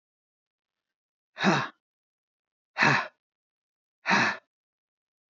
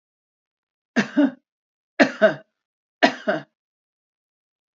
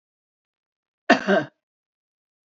{"exhalation_length": "5.3 s", "exhalation_amplitude": 15975, "exhalation_signal_mean_std_ratio": 0.3, "three_cough_length": "4.8 s", "three_cough_amplitude": 27513, "three_cough_signal_mean_std_ratio": 0.28, "cough_length": "2.5 s", "cough_amplitude": 27232, "cough_signal_mean_std_ratio": 0.24, "survey_phase": "beta (2021-08-13 to 2022-03-07)", "age": "65+", "gender": "Female", "wearing_mask": "No", "symptom_none": true, "smoker_status": "Ex-smoker", "respiratory_condition_asthma": false, "respiratory_condition_other": false, "recruitment_source": "REACT", "submission_delay": "1 day", "covid_test_result": "Negative", "covid_test_method": "RT-qPCR"}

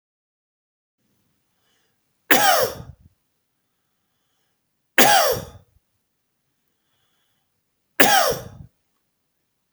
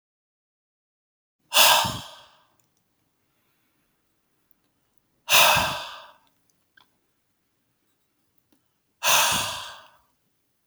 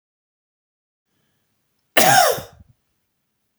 {"three_cough_length": "9.7 s", "three_cough_amplitude": 32768, "three_cough_signal_mean_std_ratio": 0.28, "exhalation_length": "10.7 s", "exhalation_amplitude": 28366, "exhalation_signal_mean_std_ratio": 0.29, "cough_length": "3.6 s", "cough_amplitude": 32767, "cough_signal_mean_std_ratio": 0.27, "survey_phase": "beta (2021-08-13 to 2022-03-07)", "age": "18-44", "gender": "Male", "wearing_mask": "No", "symptom_none": true, "smoker_status": "Never smoked", "respiratory_condition_asthma": false, "respiratory_condition_other": false, "recruitment_source": "REACT", "submission_delay": "1 day", "covid_test_result": "Negative", "covid_test_method": "RT-qPCR"}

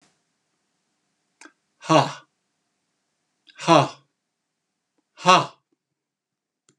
{"exhalation_length": "6.8 s", "exhalation_amplitude": 32767, "exhalation_signal_mean_std_ratio": 0.22, "survey_phase": "beta (2021-08-13 to 2022-03-07)", "age": "65+", "gender": "Male", "wearing_mask": "No", "symptom_none": true, "smoker_status": "Never smoked", "respiratory_condition_asthma": false, "respiratory_condition_other": false, "recruitment_source": "REACT", "submission_delay": "2 days", "covid_test_result": "Negative", "covid_test_method": "RT-qPCR", "influenza_a_test_result": "Negative", "influenza_b_test_result": "Negative"}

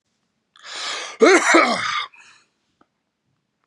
{"cough_length": "3.7 s", "cough_amplitude": 29570, "cough_signal_mean_std_ratio": 0.39, "survey_phase": "beta (2021-08-13 to 2022-03-07)", "age": "18-44", "gender": "Male", "wearing_mask": "No", "symptom_none": true, "smoker_status": "Never smoked", "respiratory_condition_asthma": false, "respiratory_condition_other": true, "recruitment_source": "REACT", "submission_delay": "0 days", "covid_test_result": "Negative", "covid_test_method": "RT-qPCR", "influenza_a_test_result": "Negative", "influenza_b_test_result": "Negative"}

